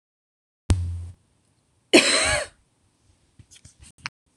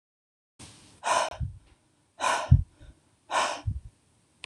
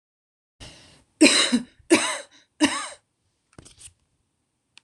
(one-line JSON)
{"cough_length": "4.4 s", "cough_amplitude": 26027, "cough_signal_mean_std_ratio": 0.32, "exhalation_length": "4.5 s", "exhalation_amplitude": 19378, "exhalation_signal_mean_std_ratio": 0.36, "three_cough_length": "4.8 s", "three_cough_amplitude": 25855, "three_cough_signal_mean_std_ratio": 0.31, "survey_phase": "alpha (2021-03-01 to 2021-08-12)", "age": "18-44", "gender": "Female", "wearing_mask": "No", "symptom_none": true, "symptom_onset": "13 days", "smoker_status": "Never smoked", "respiratory_condition_asthma": false, "respiratory_condition_other": false, "recruitment_source": "REACT", "submission_delay": "1 day", "covid_test_result": "Negative", "covid_test_method": "RT-qPCR"}